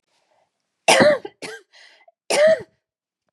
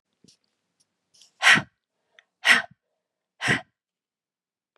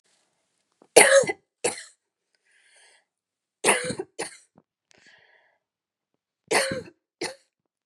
{
  "cough_length": "3.3 s",
  "cough_amplitude": 30937,
  "cough_signal_mean_std_ratio": 0.37,
  "exhalation_length": "4.8 s",
  "exhalation_amplitude": 25950,
  "exhalation_signal_mean_std_ratio": 0.24,
  "three_cough_length": "7.9 s",
  "three_cough_amplitude": 32768,
  "three_cough_signal_mean_std_ratio": 0.26,
  "survey_phase": "beta (2021-08-13 to 2022-03-07)",
  "age": "45-64",
  "gender": "Female",
  "wearing_mask": "No",
  "symptom_cough_any": true,
  "symptom_runny_or_blocked_nose": true,
  "symptom_headache": true,
  "symptom_change_to_sense_of_smell_or_taste": true,
  "symptom_loss_of_taste": true,
  "symptom_onset": "5 days",
  "smoker_status": "Never smoked",
  "respiratory_condition_asthma": false,
  "respiratory_condition_other": false,
  "recruitment_source": "Test and Trace",
  "submission_delay": "2 days",
  "covid_test_result": "Positive",
  "covid_test_method": "RT-qPCR",
  "covid_ct_value": 21.4,
  "covid_ct_gene": "N gene"
}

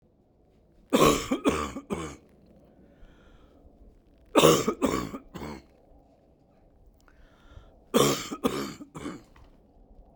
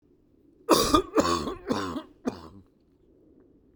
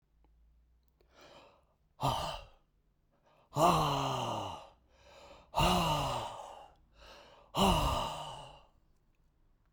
{
  "three_cough_length": "10.2 s",
  "three_cough_amplitude": 19437,
  "three_cough_signal_mean_std_ratio": 0.36,
  "cough_length": "3.8 s",
  "cough_amplitude": 19949,
  "cough_signal_mean_std_ratio": 0.41,
  "exhalation_length": "9.7 s",
  "exhalation_amplitude": 6824,
  "exhalation_signal_mean_std_ratio": 0.46,
  "survey_phase": "beta (2021-08-13 to 2022-03-07)",
  "age": "65+",
  "gender": "Male",
  "wearing_mask": "No",
  "symptom_none": true,
  "smoker_status": "Ex-smoker",
  "respiratory_condition_asthma": false,
  "respiratory_condition_other": false,
  "recruitment_source": "REACT",
  "submission_delay": "2 days",
  "covid_test_result": "Negative",
  "covid_test_method": "RT-qPCR"
}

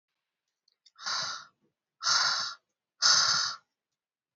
{
  "exhalation_length": "4.4 s",
  "exhalation_amplitude": 12397,
  "exhalation_signal_mean_std_ratio": 0.43,
  "survey_phase": "beta (2021-08-13 to 2022-03-07)",
  "age": "45-64",
  "gender": "Female",
  "wearing_mask": "No",
  "symptom_runny_or_blocked_nose": true,
  "symptom_other": true,
  "smoker_status": "Never smoked",
  "respiratory_condition_asthma": false,
  "respiratory_condition_other": false,
  "recruitment_source": "REACT",
  "submission_delay": "1 day",
  "covid_test_result": "Negative",
  "covid_test_method": "RT-qPCR"
}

